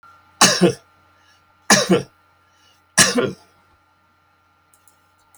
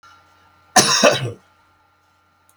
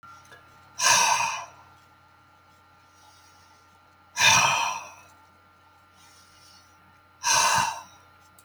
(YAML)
three_cough_length: 5.4 s
three_cough_amplitude: 32768
three_cough_signal_mean_std_ratio: 0.32
cough_length: 2.6 s
cough_amplitude: 32768
cough_signal_mean_std_ratio: 0.35
exhalation_length: 8.4 s
exhalation_amplitude: 17341
exhalation_signal_mean_std_ratio: 0.39
survey_phase: beta (2021-08-13 to 2022-03-07)
age: 65+
gender: Male
wearing_mask: 'No'
symptom_none: true
smoker_status: Ex-smoker
respiratory_condition_asthma: false
respiratory_condition_other: false
recruitment_source: REACT
submission_delay: 10 days
covid_test_result: Negative
covid_test_method: RT-qPCR